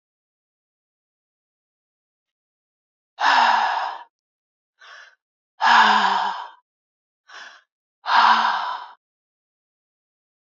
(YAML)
exhalation_length: 10.6 s
exhalation_amplitude: 22424
exhalation_signal_mean_std_ratio: 0.36
survey_phase: alpha (2021-03-01 to 2021-08-12)
age: 65+
gender: Female
wearing_mask: 'No'
symptom_none: true
smoker_status: Never smoked
respiratory_condition_asthma: false
respiratory_condition_other: false
recruitment_source: REACT
submission_delay: 2 days
covid_test_result: Negative
covid_test_method: RT-qPCR